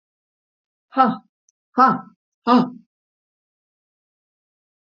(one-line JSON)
{"exhalation_length": "4.9 s", "exhalation_amplitude": 31393, "exhalation_signal_mean_std_ratio": 0.27, "survey_phase": "beta (2021-08-13 to 2022-03-07)", "age": "65+", "gender": "Female", "wearing_mask": "No", "symptom_none": true, "smoker_status": "Ex-smoker", "respiratory_condition_asthma": false, "respiratory_condition_other": false, "recruitment_source": "REACT", "submission_delay": "2 days", "covid_test_result": "Negative", "covid_test_method": "RT-qPCR", "influenza_a_test_result": "Negative", "influenza_b_test_result": "Negative"}